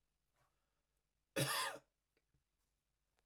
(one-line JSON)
{"cough_length": "3.3 s", "cough_amplitude": 1831, "cough_signal_mean_std_ratio": 0.28, "survey_phase": "beta (2021-08-13 to 2022-03-07)", "age": "45-64", "gender": "Male", "wearing_mask": "No", "symptom_none": true, "smoker_status": "Never smoked", "respiratory_condition_asthma": false, "respiratory_condition_other": false, "recruitment_source": "REACT", "submission_delay": "0 days", "covid_test_result": "Negative", "covid_test_method": "RT-qPCR"}